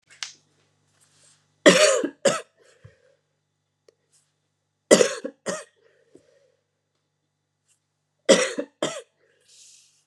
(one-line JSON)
{"three_cough_length": "10.1 s", "three_cough_amplitude": 32756, "three_cough_signal_mean_std_ratio": 0.25, "survey_phase": "beta (2021-08-13 to 2022-03-07)", "age": "18-44", "gender": "Female", "wearing_mask": "No", "symptom_cough_any": true, "symptom_runny_or_blocked_nose": true, "symptom_other": true, "smoker_status": "Never smoked", "respiratory_condition_asthma": false, "respiratory_condition_other": false, "recruitment_source": "Test and Trace", "submission_delay": "1 day", "covid_test_result": "Positive", "covid_test_method": "ePCR"}